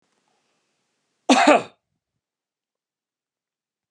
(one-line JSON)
{"cough_length": "3.9 s", "cough_amplitude": 32602, "cough_signal_mean_std_ratio": 0.22, "survey_phase": "beta (2021-08-13 to 2022-03-07)", "age": "45-64", "gender": "Male", "wearing_mask": "No", "symptom_none": true, "smoker_status": "Never smoked", "respiratory_condition_asthma": false, "respiratory_condition_other": false, "recruitment_source": "REACT", "submission_delay": "3 days", "covid_test_result": "Negative", "covid_test_method": "RT-qPCR", "influenza_a_test_result": "Negative", "influenza_b_test_result": "Negative"}